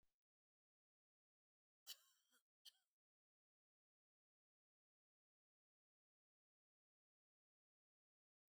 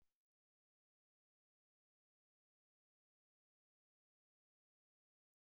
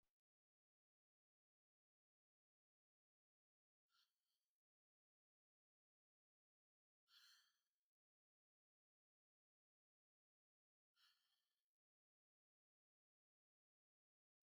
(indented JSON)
{
  "cough_length": "8.5 s",
  "cough_amplitude": 258,
  "cough_signal_mean_std_ratio": 0.11,
  "three_cough_length": "5.5 s",
  "three_cough_amplitude": 10,
  "three_cough_signal_mean_std_ratio": 0.11,
  "exhalation_length": "14.5 s",
  "exhalation_amplitude": 36,
  "exhalation_signal_mean_std_ratio": 0.18,
  "survey_phase": "beta (2021-08-13 to 2022-03-07)",
  "age": "65+",
  "gender": "Female",
  "wearing_mask": "No",
  "symptom_headache": true,
  "smoker_status": "Never smoked",
  "respiratory_condition_asthma": false,
  "respiratory_condition_other": false,
  "recruitment_source": "REACT",
  "submission_delay": "3 days",
  "covid_test_result": "Negative",
  "covid_test_method": "RT-qPCR",
  "influenza_a_test_result": "Negative",
  "influenza_b_test_result": "Negative"
}